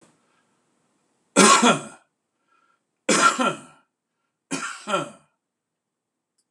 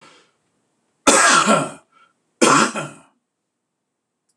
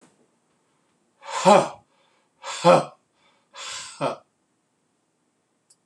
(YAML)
three_cough_length: 6.5 s
three_cough_amplitude: 26028
three_cough_signal_mean_std_ratio: 0.32
cough_length: 4.4 s
cough_amplitude: 26028
cough_signal_mean_std_ratio: 0.39
exhalation_length: 5.9 s
exhalation_amplitude: 25963
exhalation_signal_mean_std_ratio: 0.27
survey_phase: beta (2021-08-13 to 2022-03-07)
age: 45-64
gender: Male
wearing_mask: 'No'
symptom_none: true
smoker_status: Never smoked
respiratory_condition_asthma: false
respiratory_condition_other: false
recruitment_source: REACT
submission_delay: 1 day
covid_test_result: Negative
covid_test_method: RT-qPCR
influenza_a_test_result: Negative
influenza_b_test_result: Negative